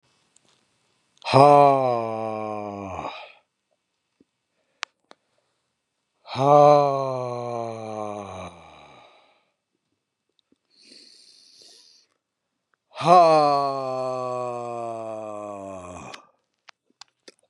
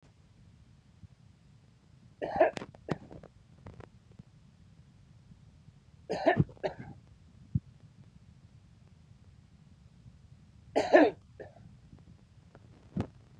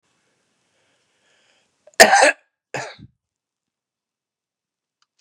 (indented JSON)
{
  "exhalation_length": "17.5 s",
  "exhalation_amplitude": 29472,
  "exhalation_signal_mean_std_ratio": 0.36,
  "three_cough_length": "13.4 s",
  "three_cough_amplitude": 13866,
  "three_cough_signal_mean_std_ratio": 0.26,
  "cough_length": "5.2 s",
  "cough_amplitude": 32768,
  "cough_signal_mean_std_ratio": 0.2,
  "survey_phase": "beta (2021-08-13 to 2022-03-07)",
  "age": "65+",
  "gender": "Male",
  "wearing_mask": "No",
  "symptom_runny_or_blocked_nose": true,
  "symptom_change_to_sense_of_smell_or_taste": true,
  "smoker_status": "Never smoked",
  "respiratory_condition_asthma": false,
  "respiratory_condition_other": false,
  "recruitment_source": "REACT",
  "submission_delay": "1 day",
  "covid_test_result": "Negative",
  "covid_test_method": "RT-qPCR",
  "influenza_a_test_result": "Unknown/Void",
  "influenza_b_test_result": "Unknown/Void"
}